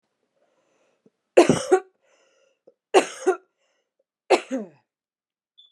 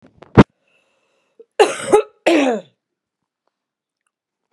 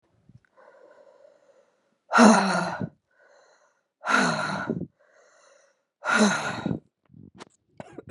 {"three_cough_length": "5.7 s", "three_cough_amplitude": 31720, "three_cough_signal_mean_std_ratio": 0.25, "cough_length": "4.5 s", "cough_amplitude": 32768, "cough_signal_mean_std_ratio": 0.28, "exhalation_length": "8.1 s", "exhalation_amplitude": 25062, "exhalation_signal_mean_std_ratio": 0.37, "survey_phase": "beta (2021-08-13 to 2022-03-07)", "age": "18-44", "gender": "Female", "wearing_mask": "No", "symptom_runny_or_blocked_nose": true, "symptom_fatigue": true, "symptom_headache": true, "smoker_status": "Current smoker (1 to 10 cigarettes per day)", "respiratory_condition_asthma": false, "respiratory_condition_other": false, "recruitment_source": "Test and Trace", "submission_delay": "2 days", "covid_test_result": "Positive", "covid_test_method": "LFT"}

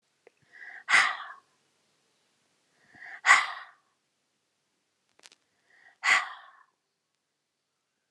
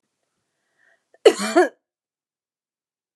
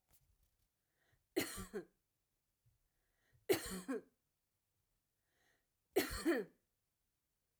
{"exhalation_length": "8.1 s", "exhalation_amplitude": 19585, "exhalation_signal_mean_std_ratio": 0.24, "cough_length": "3.2 s", "cough_amplitude": 29166, "cough_signal_mean_std_ratio": 0.22, "three_cough_length": "7.6 s", "three_cough_amplitude": 2811, "three_cough_signal_mean_std_ratio": 0.29, "survey_phase": "alpha (2021-03-01 to 2021-08-12)", "age": "45-64", "gender": "Female", "wearing_mask": "No", "symptom_none": true, "smoker_status": "Never smoked", "respiratory_condition_asthma": true, "respiratory_condition_other": false, "recruitment_source": "REACT", "submission_delay": "2 days", "covid_test_result": "Negative", "covid_test_method": "RT-qPCR"}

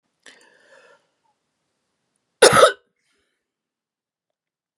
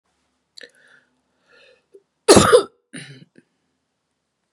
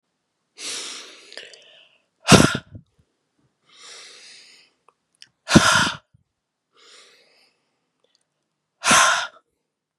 {"three_cough_length": "4.8 s", "three_cough_amplitude": 32768, "three_cough_signal_mean_std_ratio": 0.19, "cough_length": "4.5 s", "cough_amplitude": 32768, "cough_signal_mean_std_ratio": 0.22, "exhalation_length": "10.0 s", "exhalation_amplitude": 32768, "exhalation_signal_mean_std_ratio": 0.27, "survey_phase": "beta (2021-08-13 to 2022-03-07)", "age": "45-64", "gender": "Female", "wearing_mask": "No", "symptom_cough_any": true, "symptom_runny_or_blocked_nose": true, "symptom_sore_throat": true, "symptom_fatigue": true, "symptom_headache": true, "symptom_onset": "5 days", "smoker_status": "Never smoked", "respiratory_condition_asthma": false, "respiratory_condition_other": false, "recruitment_source": "REACT", "submission_delay": "3 days", "covid_test_result": "Negative", "covid_test_method": "RT-qPCR", "influenza_a_test_result": "Unknown/Void", "influenza_b_test_result": "Unknown/Void"}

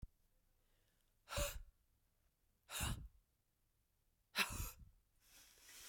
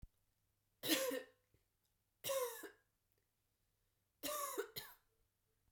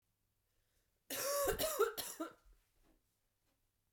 {"exhalation_length": "5.9 s", "exhalation_amplitude": 2189, "exhalation_signal_mean_std_ratio": 0.35, "three_cough_length": "5.7 s", "three_cough_amplitude": 2904, "three_cough_signal_mean_std_ratio": 0.38, "cough_length": "3.9 s", "cough_amplitude": 2494, "cough_signal_mean_std_ratio": 0.42, "survey_phase": "beta (2021-08-13 to 2022-03-07)", "age": "18-44", "gender": "Female", "wearing_mask": "No", "symptom_cough_any": true, "symptom_runny_or_blocked_nose": true, "symptom_shortness_of_breath": true, "symptom_sore_throat": true, "symptom_abdominal_pain": true, "symptom_fatigue": true, "symptom_change_to_sense_of_smell_or_taste": true, "symptom_other": true, "symptom_onset": "3 days", "smoker_status": "Never smoked", "respiratory_condition_asthma": false, "respiratory_condition_other": false, "recruitment_source": "Test and Trace", "submission_delay": "1 day", "covid_test_result": "Positive", "covid_test_method": "RT-qPCR", "covid_ct_value": 14.7, "covid_ct_gene": "ORF1ab gene", "covid_ct_mean": 14.9, "covid_viral_load": "13000000 copies/ml", "covid_viral_load_category": "High viral load (>1M copies/ml)"}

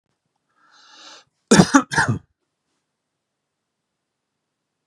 {"cough_length": "4.9 s", "cough_amplitude": 32768, "cough_signal_mean_std_ratio": 0.23, "survey_phase": "beta (2021-08-13 to 2022-03-07)", "age": "45-64", "gender": "Male", "wearing_mask": "No", "symptom_none": true, "smoker_status": "Ex-smoker", "respiratory_condition_asthma": true, "respiratory_condition_other": false, "recruitment_source": "REACT", "submission_delay": "3 days", "covid_test_result": "Negative", "covid_test_method": "RT-qPCR", "influenza_a_test_result": "Negative", "influenza_b_test_result": "Negative"}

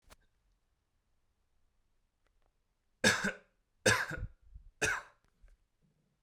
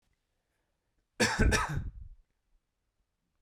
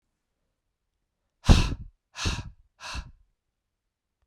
{"three_cough_length": "6.2 s", "three_cough_amplitude": 8132, "three_cough_signal_mean_std_ratio": 0.27, "cough_length": "3.4 s", "cough_amplitude": 8323, "cough_signal_mean_std_ratio": 0.35, "exhalation_length": "4.3 s", "exhalation_amplitude": 22078, "exhalation_signal_mean_std_ratio": 0.24, "survey_phase": "beta (2021-08-13 to 2022-03-07)", "age": "18-44", "gender": "Male", "wearing_mask": "No", "symptom_cough_any": true, "symptom_runny_or_blocked_nose": true, "symptom_sore_throat": true, "smoker_status": "Never smoked", "respiratory_condition_asthma": false, "respiratory_condition_other": false, "recruitment_source": "Test and Trace", "submission_delay": "2 days", "covid_test_result": "Positive", "covid_test_method": "RT-qPCR", "covid_ct_value": 18.5, "covid_ct_gene": "ORF1ab gene", "covid_ct_mean": 18.8, "covid_viral_load": "700000 copies/ml", "covid_viral_load_category": "Low viral load (10K-1M copies/ml)"}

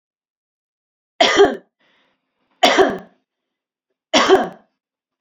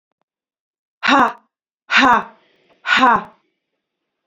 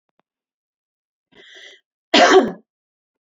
{"three_cough_length": "5.2 s", "three_cough_amplitude": 30580, "three_cough_signal_mean_std_ratio": 0.34, "exhalation_length": "4.3 s", "exhalation_amplitude": 30110, "exhalation_signal_mean_std_ratio": 0.37, "cough_length": "3.3 s", "cough_amplitude": 29472, "cough_signal_mean_std_ratio": 0.27, "survey_phase": "alpha (2021-03-01 to 2021-08-12)", "age": "45-64", "gender": "Female", "wearing_mask": "No", "symptom_none": true, "smoker_status": "Ex-smoker", "respiratory_condition_asthma": false, "respiratory_condition_other": false, "recruitment_source": "REACT", "submission_delay": "2 days", "covid_test_result": "Negative", "covid_test_method": "RT-qPCR"}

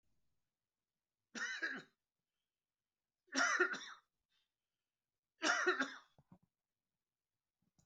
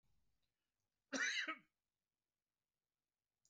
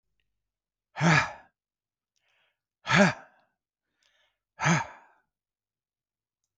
{"three_cough_length": "7.9 s", "three_cough_amplitude": 2948, "three_cough_signal_mean_std_ratio": 0.31, "cough_length": "3.5 s", "cough_amplitude": 1198, "cough_signal_mean_std_ratio": 0.28, "exhalation_length": "6.6 s", "exhalation_amplitude": 14392, "exhalation_signal_mean_std_ratio": 0.27, "survey_phase": "beta (2021-08-13 to 2022-03-07)", "age": "45-64", "gender": "Male", "wearing_mask": "No", "symptom_cough_any": true, "symptom_shortness_of_breath": true, "symptom_fatigue": true, "symptom_onset": "12 days", "smoker_status": "Ex-smoker", "respiratory_condition_asthma": false, "respiratory_condition_other": true, "recruitment_source": "REACT", "submission_delay": "5 days", "covid_test_result": "Negative", "covid_test_method": "RT-qPCR", "influenza_a_test_result": "Negative", "influenza_b_test_result": "Negative"}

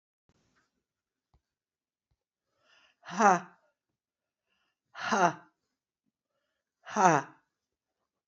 {"exhalation_length": "8.3 s", "exhalation_amplitude": 17035, "exhalation_signal_mean_std_ratio": 0.22, "survey_phase": "beta (2021-08-13 to 2022-03-07)", "age": "45-64", "gender": "Female", "wearing_mask": "No", "symptom_cough_any": true, "symptom_sore_throat": true, "symptom_onset": "27 days", "smoker_status": "Ex-smoker", "respiratory_condition_asthma": false, "respiratory_condition_other": false, "recruitment_source": "Test and Trace", "submission_delay": "24 days", "covid_test_result": "Negative", "covid_test_method": "RT-qPCR"}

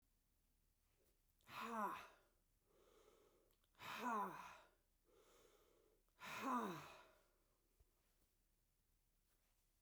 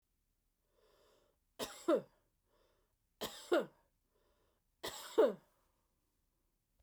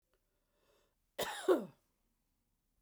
{"exhalation_length": "9.8 s", "exhalation_amplitude": 679, "exhalation_signal_mean_std_ratio": 0.38, "three_cough_length": "6.8 s", "three_cough_amplitude": 3718, "three_cough_signal_mean_std_ratio": 0.25, "cough_length": "2.8 s", "cough_amplitude": 4128, "cough_signal_mean_std_ratio": 0.25, "survey_phase": "beta (2021-08-13 to 2022-03-07)", "age": "45-64", "gender": "Female", "wearing_mask": "No", "symptom_cough_any": true, "symptom_runny_or_blocked_nose": true, "symptom_sore_throat": true, "symptom_headache": true, "smoker_status": "Ex-smoker", "respiratory_condition_asthma": false, "respiratory_condition_other": false, "recruitment_source": "Test and Trace", "submission_delay": "1 day", "covid_test_result": "Positive", "covid_test_method": "ePCR"}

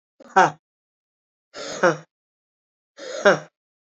{"exhalation_length": "3.8 s", "exhalation_amplitude": 28212, "exhalation_signal_mean_std_ratio": 0.27, "survey_phase": "alpha (2021-03-01 to 2021-08-12)", "age": "45-64", "gender": "Female", "wearing_mask": "No", "symptom_cough_any": true, "symptom_shortness_of_breath": true, "symptom_fatigue": true, "symptom_headache": true, "symptom_onset": "3 days", "smoker_status": "Ex-smoker", "respiratory_condition_asthma": true, "respiratory_condition_other": false, "recruitment_source": "Test and Trace", "submission_delay": "1 day", "covid_test_result": "Positive", "covid_test_method": "RT-qPCR", "covid_ct_value": 11.9, "covid_ct_gene": "S gene", "covid_ct_mean": 12.1, "covid_viral_load": "110000000 copies/ml", "covid_viral_load_category": "High viral load (>1M copies/ml)"}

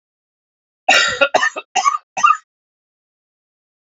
{"cough_length": "3.9 s", "cough_amplitude": 28365, "cough_signal_mean_std_ratio": 0.37, "survey_phase": "beta (2021-08-13 to 2022-03-07)", "age": "45-64", "gender": "Male", "wearing_mask": "No", "symptom_cough_any": true, "symptom_runny_or_blocked_nose": true, "symptom_shortness_of_breath": true, "symptom_sore_throat": true, "symptom_fever_high_temperature": true, "symptom_headache": true, "symptom_onset": "3 days", "smoker_status": "Never smoked", "respiratory_condition_asthma": true, "respiratory_condition_other": false, "recruitment_source": "Test and Trace", "submission_delay": "1 day", "covid_test_result": "Positive", "covid_test_method": "RT-qPCR", "covid_ct_value": 21.8, "covid_ct_gene": "ORF1ab gene"}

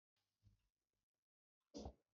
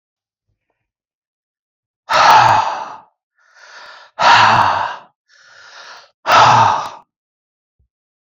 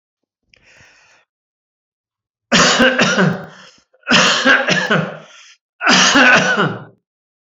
{"cough_length": "2.1 s", "cough_amplitude": 302, "cough_signal_mean_std_ratio": 0.25, "exhalation_length": "8.3 s", "exhalation_amplitude": 30746, "exhalation_signal_mean_std_ratio": 0.42, "three_cough_length": "7.5 s", "three_cough_amplitude": 32767, "three_cough_signal_mean_std_ratio": 0.52, "survey_phase": "alpha (2021-03-01 to 2021-08-12)", "age": "65+", "gender": "Male", "wearing_mask": "No", "symptom_none": true, "smoker_status": "Never smoked", "respiratory_condition_asthma": false, "respiratory_condition_other": false, "recruitment_source": "REACT", "submission_delay": "4 days", "covid_test_result": "Negative", "covid_test_method": "RT-qPCR"}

